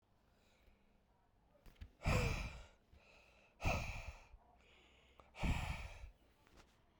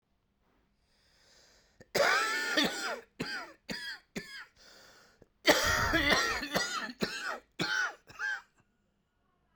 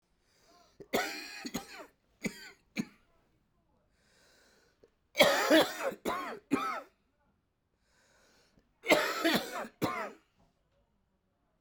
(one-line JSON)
{"exhalation_length": "7.0 s", "exhalation_amplitude": 2248, "exhalation_signal_mean_std_ratio": 0.4, "cough_length": "9.6 s", "cough_amplitude": 12045, "cough_signal_mean_std_ratio": 0.5, "three_cough_length": "11.6 s", "three_cough_amplitude": 11723, "three_cough_signal_mean_std_ratio": 0.35, "survey_phase": "beta (2021-08-13 to 2022-03-07)", "age": "45-64", "gender": "Male", "wearing_mask": "No", "symptom_new_continuous_cough": true, "symptom_runny_or_blocked_nose": true, "symptom_shortness_of_breath": true, "symptom_fatigue": true, "symptom_fever_high_temperature": true, "symptom_headache": true, "symptom_onset": "5 days", "smoker_status": "Never smoked", "respiratory_condition_asthma": false, "respiratory_condition_other": false, "recruitment_source": "Test and Trace", "submission_delay": "2 days", "covid_test_result": "Positive", "covid_test_method": "RT-qPCR", "covid_ct_value": 21.9, "covid_ct_gene": "ORF1ab gene"}